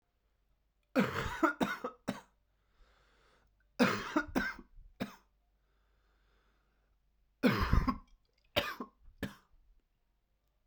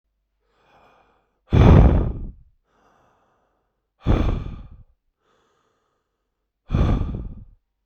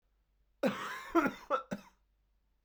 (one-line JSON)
{"three_cough_length": "10.7 s", "three_cough_amplitude": 6848, "three_cough_signal_mean_std_ratio": 0.34, "exhalation_length": "7.9 s", "exhalation_amplitude": 31847, "exhalation_signal_mean_std_ratio": 0.34, "cough_length": "2.6 s", "cough_amplitude": 5213, "cough_signal_mean_std_ratio": 0.39, "survey_phase": "beta (2021-08-13 to 2022-03-07)", "age": "18-44", "gender": "Male", "wearing_mask": "No", "symptom_cough_any": true, "symptom_new_continuous_cough": true, "symptom_runny_or_blocked_nose": true, "symptom_sore_throat": true, "symptom_fatigue": true, "symptom_change_to_sense_of_smell_or_taste": true, "symptom_onset": "5 days", "smoker_status": "Current smoker (e-cigarettes or vapes only)", "respiratory_condition_asthma": false, "respiratory_condition_other": false, "recruitment_source": "Test and Trace", "submission_delay": "1 day", "covid_test_result": "Negative", "covid_test_method": "RT-qPCR"}